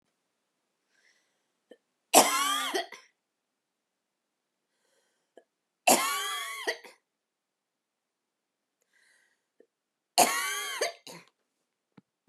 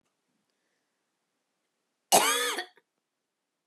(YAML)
three_cough_length: 12.3 s
three_cough_amplitude: 22111
three_cough_signal_mean_std_ratio: 0.28
cough_length: 3.7 s
cough_amplitude: 15015
cough_signal_mean_std_ratio: 0.26
survey_phase: beta (2021-08-13 to 2022-03-07)
age: 18-44
gender: Female
wearing_mask: 'No'
symptom_cough_any: true
symptom_runny_or_blocked_nose: true
symptom_onset: 6 days
smoker_status: Ex-smoker
respiratory_condition_asthma: false
respiratory_condition_other: false
recruitment_source: REACT
submission_delay: 0 days
covid_test_result: Negative
covid_test_method: RT-qPCR